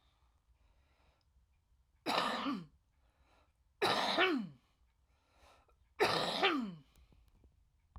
{"three_cough_length": "8.0 s", "three_cough_amplitude": 4181, "three_cough_signal_mean_std_ratio": 0.41, "survey_phase": "alpha (2021-03-01 to 2021-08-12)", "age": "45-64", "gender": "Female", "wearing_mask": "No", "symptom_cough_any": true, "symptom_fatigue": true, "smoker_status": "Current smoker (11 or more cigarettes per day)", "respiratory_condition_asthma": true, "respiratory_condition_other": true, "recruitment_source": "REACT", "submission_delay": "2 days", "covid_test_result": "Negative", "covid_test_method": "RT-qPCR"}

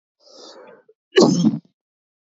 {"cough_length": "2.3 s", "cough_amplitude": 27280, "cough_signal_mean_std_ratio": 0.34, "survey_phase": "beta (2021-08-13 to 2022-03-07)", "age": "18-44", "gender": "Male", "wearing_mask": "No", "symptom_headache": true, "symptom_change_to_sense_of_smell_or_taste": true, "symptom_loss_of_taste": true, "symptom_other": true, "smoker_status": "Ex-smoker", "respiratory_condition_asthma": false, "respiratory_condition_other": false, "recruitment_source": "Test and Trace", "submission_delay": "1 day", "covid_test_result": "Positive", "covid_test_method": "RT-qPCR"}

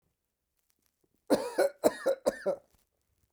{"cough_length": "3.3 s", "cough_amplitude": 10406, "cough_signal_mean_std_ratio": 0.35, "survey_phase": "beta (2021-08-13 to 2022-03-07)", "age": "65+", "gender": "Male", "wearing_mask": "No", "symptom_cough_any": true, "symptom_runny_or_blocked_nose": true, "symptom_sore_throat": true, "smoker_status": "Ex-smoker", "respiratory_condition_asthma": false, "respiratory_condition_other": false, "recruitment_source": "REACT", "submission_delay": "1 day", "covid_test_result": "Negative", "covid_test_method": "RT-qPCR"}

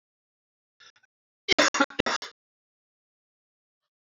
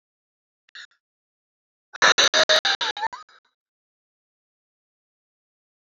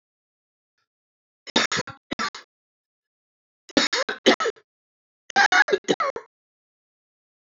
{"cough_length": "4.1 s", "cough_amplitude": 15534, "cough_signal_mean_std_ratio": 0.22, "exhalation_length": "5.8 s", "exhalation_amplitude": 20581, "exhalation_signal_mean_std_ratio": 0.27, "three_cough_length": "7.5 s", "three_cough_amplitude": 22806, "three_cough_signal_mean_std_ratio": 0.31, "survey_phase": "beta (2021-08-13 to 2022-03-07)", "age": "18-44", "gender": "Male", "wearing_mask": "Yes", "symptom_cough_any": true, "symptom_new_continuous_cough": true, "symptom_runny_or_blocked_nose": true, "symptom_shortness_of_breath": true, "symptom_sore_throat": true, "symptom_fatigue": true, "symptom_headache": true, "symptom_change_to_sense_of_smell_or_taste": true, "symptom_loss_of_taste": true, "symptom_onset": "2 days", "smoker_status": "Never smoked", "respiratory_condition_asthma": true, "respiratory_condition_other": false, "recruitment_source": "Test and Trace", "submission_delay": "1 day", "covid_test_result": "Positive", "covid_test_method": "RT-qPCR", "covid_ct_value": 30.2, "covid_ct_gene": "ORF1ab gene", "covid_ct_mean": 30.9, "covid_viral_load": "74 copies/ml", "covid_viral_load_category": "Minimal viral load (< 10K copies/ml)"}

